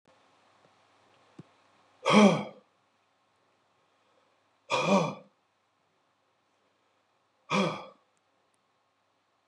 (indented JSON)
{
  "exhalation_length": "9.5 s",
  "exhalation_amplitude": 13792,
  "exhalation_signal_mean_std_ratio": 0.25,
  "survey_phase": "beta (2021-08-13 to 2022-03-07)",
  "age": "45-64",
  "gender": "Male",
  "wearing_mask": "No",
  "symptom_cough_any": true,
  "symptom_runny_or_blocked_nose": true,
  "symptom_shortness_of_breath": true,
  "symptom_sore_throat": true,
  "symptom_fatigue": true,
  "symptom_headache": true,
  "symptom_onset": "4 days",
  "smoker_status": "Ex-smoker",
  "respiratory_condition_asthma": false,
  "respiratory_condition_other": false,
  "recruitment_source": "Test and Trace",
  "submission_delay": "2 days",
  "covid_test_result": "Positive",
  "covid_test_method": "RT-qPCR",
  "covid_ct_value": 17.8,
  "covid_ct_gene": "ORF1ab gene",
  "covid_ct_mean": 18.2,
  "covid_viral_load": "1100000 copies/ml",
  "covid_viral_load_category": "High viral load (>1M copies/ml)"
}